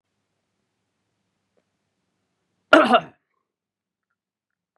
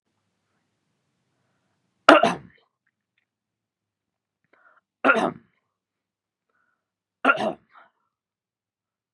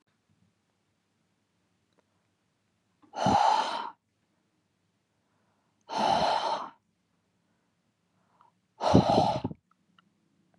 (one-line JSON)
{"cough_length": "4.8 s", "cough_amplitude": 32768, "cough_signal_mean_std_ratio": 0.17, "three_cough_length": "9.1 s", "three_cough_amplitude": 32768, "three_cough_signal_mean_std_ratio": 0.19, "exhalation_length": "10.6 s", "exhalation_amplitude": 18227, "exhalation_signal_mean_std_ratio": 0.34, "survey_phase": "beta (2021-08-13 to 2022-03-07)", "age": "18-44", "gender": "Male", "wearing_mask": "No", "symptom_none": true, "smoker_status": "Never smoked", "respiratory_condition_asthma": false, "respiratory_condition_other": false, "recruitment_source": "REACT", "submission_delay": "2 days", "covid_test_result": "Negative", "covid_test_method": "RT-qPCR", "covid_ct_value": 39.0, "covid_ct_gene": "N gene", "influenza_a_test_result": "Negative", "influenza_b_test_result": "Negative"}